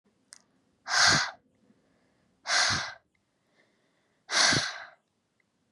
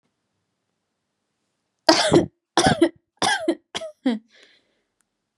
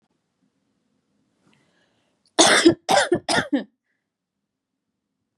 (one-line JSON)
{"exhalation_length": "5.7 s", "exhalation_amplitude": 11851, "exhalation_signal_mean_std_ratio": 0.37, "three_cough_length": "5.4 s", "three_cough_amplitude": 32767, "three_cough_signal_mean_std_ratio": 0.34, "cough_length": "5.4 s", "cough_amplitude": 28838, "cough_signal_mean_std_ratio": 0.3, "survey_phase": "beta (2021-08-13 to 2022-03-07)", "age": "18-44", "gender": "Female", "wearing_mask": "No", "symptom_none": true, "smoker_status": "Never smoked", "respiratory_condition_asthma": false, "respiratory_condition_other": false, "recruitment_source": "REACT", "submission_delay": "1 day", "covid_test_result": "Negative", "covid_test_method": "RT-qPCR", "influenza_a_test_result": "Negative", "influenza_b_test_result": "Negative"}